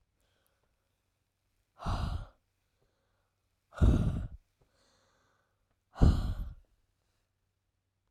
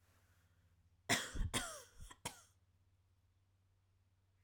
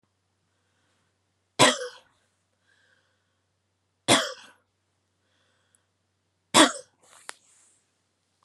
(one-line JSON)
{"exhalation_length": "8.1 s", "exhalation_amplitude": 12804, "exhalation_signal_mean_std_ratio": 0.28, "cough_length": "4.4 s", "cough_amplitude": 2916, "cough_signal_mean_std_ratio": 0.32, "three_cough_length": "8.4 s", "three_cough_amplitude": 29206, "three_cough_signal_mean_std_ratio": 0.2, "survey_phase": "alpha (2021-03-01 to 2021-08-12)", "age": "18-44", "gender": "Female", "wearing_mask": "No", "symptom_none": true, "smoker_status": "Never smoked", "respiratory_condition_asthma": false, "respiratory_condition_other": false, "recruitment_source": "REACT", "submission_delay": "1 day", "covid_test_result": "Negative", "covid_test_method": "RT-qPCR"}